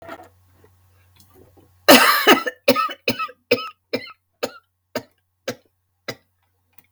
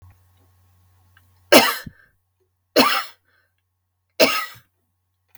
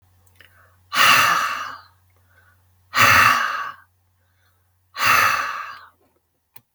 {"cough_length": "6.9 s", "cough_amplitude": 32768, "cough_signal_mean_std_ratio": 0.3, "three_cough_length": "5.4 s", "three_cough_amplitude": 32768, "three_cough_signal_mean_std_ratio": 0.27, "exhalation_length": "6.7 s", "exhalation_amplitude": 32766, "exhalation_signal_mean_std_ratio": 0.44, "survey_phase": "beta (2021-08-13 to 2022-03-07)", "age": "65+", "gender": "Female", "wearing_mask": "No", "symptom_none": true, "smoker_status": "Ex-smoker", "respiratory_condition_asthma": false, "respiratory_condition_other": false, "recruitment_source": "REACT", "submission_delay": "0 days", "covid_test_result": "Negative", "covid_test_method": "RT-qPCR", "influenza_a_test_result": "Negative", "influenza_b_test_result": "Negative"}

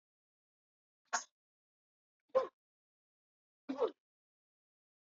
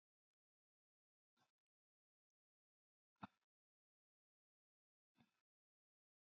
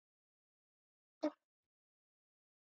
{"three_cough_length": "5.0 s", "three_cough_amplitude": 3411, "three_cough_signal_mean_std_ratio": 0.2, "exhalation_length": "6.3 s", "exhalation_amplitude": 383, "exhalation_signal_mean_std_ratio": 0.07, "cough_length": "2.6 s", "cough_amplitude": 1597, "cough_signal_mean_std_ratio": 0.12, "survey_phase": "beta (2021-08-13 to 2022-03-07)", "age": "45-64", "gender": "Female", "wearing_mask": "No", "symptom_none": true, "smoker_status": "Never smoked", "respiratory_condition_asthma": false, "respiratory_condition_other": false, "recruitment_source": "REACT", "submission_delay": "3 days", "covid_test_result": "Negative", "covid_test_method": "RT-qPCR"}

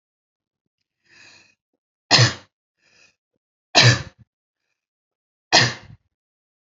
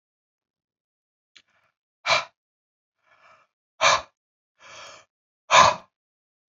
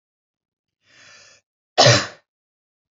{"three_cough_length": "6.7 s", "three_cough_amplitude": 31011, "three_cough_signal_mean_std_ratio": 0.24, "exhalation_length": "6.5 s", "exhalation_amplitude": 27321, "exhalation_signal_mean_std_ratio": 0.23, "cough_length": "2.9 s", "cough_amplitude": 30050, "cough_signal_mean_std_ratio": 0.24, "survey_phase": "beta (2021-08-13 to 2022-03-07)", "age": "18-44", "gender": "Female", "wearing_mask": "No", "symptom_runny_or_blocked_nose": true, "symptom_headache": true, "smoker_status": "Never smoked", "respiratory_condition_asthma": false, "respiratory_condition_other": false, "recruitment_source": "REACT", "submission_delay": "2 days", "covid_test_result": "Negative", "covid_test_method": "RT-qPCR", "influenza_a_test_result": "Negative", "influenza_b_test_result": "Negative"}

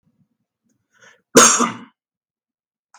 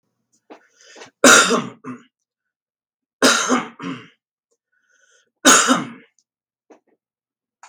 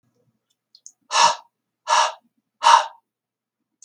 {"cough_length": "3.0 s", "cough_amplitude": 32768, "cough_signal_mean_std_ratio": 0.26, "three_cough_length": "7.7 s", "three_cough_amplitude": 32768, "three_cough_signal_mean_std_ratio": 0.31, "exhalation_length": "3.8 s", "exhalation_amplitude": 32766, "exhalation_signal_mean_std_ratio": 0.32, "survey_phase": "beta (2021-08-13 to 2022-03-07)", "age": "65+", "gender": "Male", "wearing_mask": "No", "symptom_cough_any": true, "smoker_status": "Never smoked", "respiratory_condition_asthma": false, "respiratory_condition_other": false, "recruitment_source": "REACT", "submission_delay": "0 days", "covid_test_result": "Negative", "covid_test_method": "RT-qPCR", "influenza_a_test_result": "Negative", "influenza_b_test_result": "Negative"}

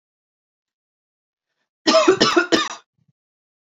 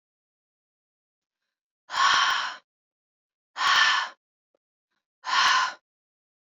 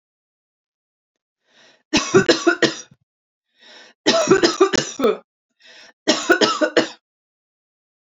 {"cough_length": "3.7 s", "cough_amplitude": 27342, "cough_signal_mean_std_ratio": 0.34, "exhalation_length": "6.6 s", "exhalation_amplitude": 13794, "exhalation_signal_mean_std_ratio": 0.39, "three_cough_length": "8.1 s", "three_cough_amplitude": 29877, "three_cough_signal_mean_std_ratio": 0.39, "survey_phase": "alpha (2021-03-01 to 2021-08-12)", "age": "18-44", "gender": "Female", "wearing_mask": "No", "symptom_none": true, "symptom_onset": "12 days", "smoker_status": "Never smoked", "respiratory_condition_asthma": false, "respiratory_condition_other": false, "recruitment_source": "REACT", "submission_delay": "1 day", "covid_test_result": "Negative", "covid_test_method": "RT-qPCR"}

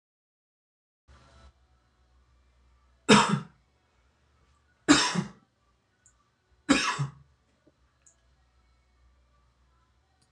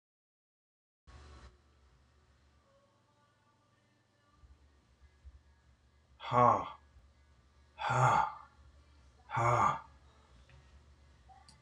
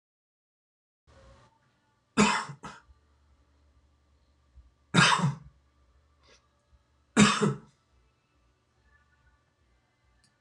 {"three_cough_length": "10.3 s", "three_cough_amplitude": 22012, "three_cough_signal_mean_std_ratio": 0.23, "exhalation_length": "11.6 s", "exhalation_amplitude": 7553, "exhalation_signal_mean_std_ratio": 0.29, "cough_length": "10.4 s", "cough_amplitude": 16224, "cough_signal_mean_std_ratio": 0.25, "survey_phase": "alpha (2021-03-01 to 2021-08-12)", "age": "65+", "gender": "Male", "wearing_mask": "No", "symptom_none": true, "symptom_onset": "12 days", "smoker_status": "Never smoked", "respiratory_condition_asthma": false, "respiratory_condition_other": false, "recruitment_source": "REACT", "submission_delay": "3 days", "covid_test_result": "Negative", "covid_test_method": "RT-qPCR"}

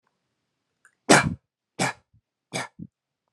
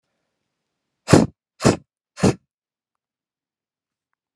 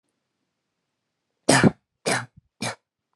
{"three_cough_length": "3.3 s", "three_cough_amplitude": 30018, "three_cough_signal_mean_std_ratio": 0.24, "exhalation_length": "4.4 s", "exhalation_amplitude": 32768, "exhalation_signal_mean_std_ratio": 0.22, "cough_length": "3.2 s", "cough_amplitude": 26158, "cough_signal_mean_std_ratio": 0.27, "survey_phase": "alpha (2021-03-01 to 2021-08-12)", "age": "18-44", "gender": "Male", "wearing_mask": "No", "symptom_none": true, "smoker_status": "Never smoked", "respiratory_condition_asthma": false, "respiratory_condition_other": false, "recruitment_source": "REACT", "submission_delay": "3 days", "covid_test_result": "Negative", "covid_test_method": "RT-qPCR"}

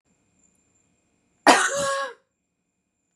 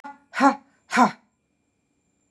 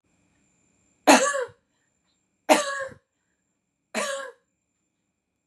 {"cough_length": "3.2 s", "cough_amplitude": 30770, "cough_signal_mean_std_ratio": 0.3, "exhalation_length": "2.3 s", "exhalation_amplitude": 23403, "exhalation_signal_mean_std_ratio": 0.3, "three_cough_length": "5.5 s", "three_cough_amplitude": 28506, "three_cough_signal_mean_std_ratio": 0.27, "survey_phase": "beta (2021-08-13 to 2022-03-07)", "age": "45-64", "gender": "Female", "wearing_mask": "No", "symptom_none": true, "smoker_status": "Never smoked", "respiratory_condition_asthma": false, "respiratory_condition_other": false, "recruitment_source": "REACT", "submission_delay": "4 days", "covid_test_result": "Negative", "covid_test_method": "RT-qPCR", "influenza_a_test_result": "Negative", "influenza_b_test_result": "Negative"}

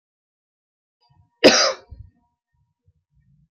{"cough_length": "3.6 s", "cough_amplitude": 28228, "cough_signal_mean_std_ratio": 0.22, "survey_phase": "alpha (2021-03-01 to 2021-08-12)", "age": "45-64", "gender": "Female", "wearing_mask": "No", "symptom_none": true, "smoker_status": "Never smoked", "respiratory_condition_asthma": false, "respiratory_condition_other": false, "recruitment_source": "REACT", "submission_delay": "2 days", "covid_test_result": "Negative", "covid_test_method": "RT-qPCR"}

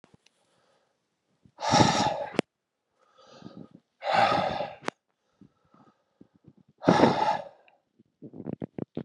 {"exhalation_length": "9.0 s", "exhalation_amplitude": 19354, "exhalation_signal_mean_std_ratio": 0.36, "survey_phase": "alpha (2021-03-01 to 2021-08-12)", "age": "18-44", "gender": "Male", "wearing_mask": "No", "symptom_cough_any": true, "symptom_fatigue": true, "symptom_fever_high_temperature": true, "symptom_headache": true, "symptom_onset": "2 days", "smoker_status": "Never smoked", "respiratory_condition_asthma": false, "respiratory_condition_other": false, "recruitment_source": "Test and Trace", "submission_delay": "1 day", "covid_test_result": "Positive", "covid_test_method": "RT-qPCR"}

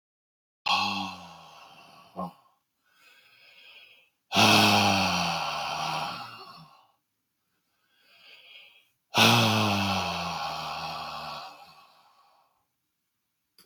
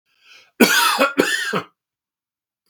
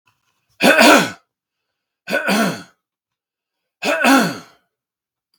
{"exhalation_length": "13.7 s", "exhalation_amplitude": 17925, "exhalation_signal_mean_std_ratio": 0.44, "cough_length": "2.7 s", "cough_amplitude": 32768, "cough_signal_mean_std_ratio": 0.45, "three_cough_length": "5.4 s", "three_cough_amplitude": 32768, "three_cough_signal_mean_std_ratio": 0.39, "survey_phase": "beta (2021-08-13 to 2022-03-07)", "age": "45-64", "gender": "Male", "wearing_mask": "No", "symptom_none": true, "smoker_status": "Never smoked", "respiratory_condition_asthma": false, "respiratory_condition_other": false, "recruitment_source": "REACT", "submission_delay": "1 day", "covid_test_result": "Negative", "covid_test_method": "RT-qPCR", "influenza_a_test_result": "Negative", "influenza_b_test_result": "Negative"}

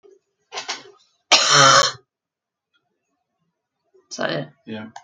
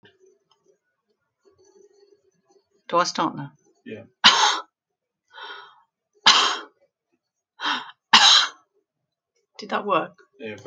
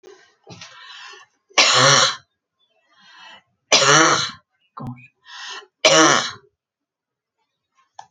{"cough_length": "5.0 s", "cough_amplitude": 30572, "cough_signal_mean_std_ratio": 0.33, "exhalation_length": "10.7 s", "exhalation_amplitude": 30955, "exhalation_signal_mean_std_ratio": 0.32, "three_cough_length": "8.1 s", "three_cough_amplitude": 32767, "three_cough_signal_mean_std_ratio": 0.38, "survey_phase": "alpha (2021-03-01 to 2021-08-12)", "age": "65+", "gender": "Female", "wearing_mask": "No", "symptom_none": true, "smoker_status": "Never smoked", "respiratory_condition_asthma": false, "respiratory_condition_other": false, "recruitment_source": "REACT", "submission_delay": "3 days", "covid_test_result": "Negative", "covid_test_method": "RT-qPCR"}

